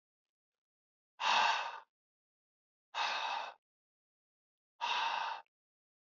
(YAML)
exhalation_length: 6.1 s
exhalation_amplitude: 4293
exhalation_signal_mean_std_ratio: 0.41
survey_phase: alpha (2021-03-01 to 2021-08-12)
age: 18-44
gender: Male
wearing_mask: 'No'
symptom_none: true
smoker_status: Never smoked
respiratory_condition_asthma: false
respiratory_condition_other: false
recruitment_source: REACT
submission_delay: 1 day
covid_test_result: Negative
covid_test_method: RT-qPCR